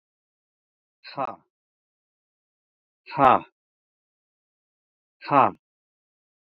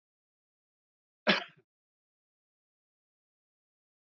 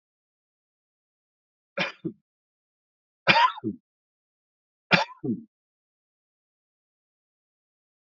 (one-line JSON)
{"exhalation_length": "6.6 s", "exhalation_amplitude": 26754, "exhalation_signal_mean_std_ratio": 0.19, "cough_length": "4.2 s", "cough_amplitude": 10315, "cough_signal_mean_std_ratio": 0.14, "three_cough_length": "8.2 s", "three_cough_amplitude": 26757, "three_cough_signal_mean_std_ratio": 0.22, "survey_phase": "alpha (2021-03-01 to 2021-08-12)", "age": "65+", "gender": "Male", "wearing_mask": "No", "symptom_none": true, "symptom_onset": "11 days", "smoker_status": "Never smoked", "respiratory_condition_asthma": false, "respiratory_condition_other": false, "recruitment_source": "REACT", "submission_delay": "1 day", "covid_test_result": "Negative", "covid_test_method": "RT-qPCR"}